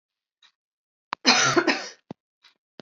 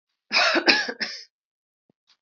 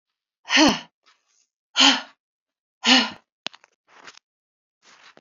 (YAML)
cough_length: 2.8 s
cough_amplitude: 22383
cough_signal_mean_std_ratio: 0.34
three_cough_length: 2.2 s
three_cough_amplitude: 29832
three_cough_signal_mean_std_ratio: 0.42
exhalation_length: 5.2 s
exhalation_amplitude: 27726
exhalation_signal_mean_std_ratio: 0.3
survey_phase: beta (2021-08-13 to 2022-03-07)
age: 18-44
gender: Female
wearing_mask: 'No'
symptom_none: true
symptom_onset: 6 days
smoker_status: Ex-smoker
respiratory_condition_asthma: false
respiratory_condition_other: false
recruitment_source: REACT
submission_delay: 1 day
covid_test_result: Negative
covid_test_method: RT-qPCR
influenza_a_test_result: Negative
influenza_b_test_result: Negative